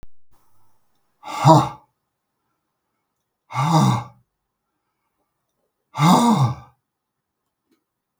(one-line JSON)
{"exhalation_length": "8.2 s", "exhalation_amplitude": 32768, "exhalation_signal_mean_std_ratio": 0.33, "survey_phase": "beta (2021-08-13 to 2022-03-07)", "age": "65+", "gender": "Male", "wearing_mask": "No", "symptom_none": true, "smoker_status": "Ex-smoker", "respiratory_condition_asthma": false, "respiratory_condition_other": false, "recruitment_source": "REACT", "submission_delay": "2 days", "covid_test_result": "Negative", "covid_test_method": "RT-qPCR", "influenza_a_test_result": "Negative", "influenza_b_test_result": "Negative"}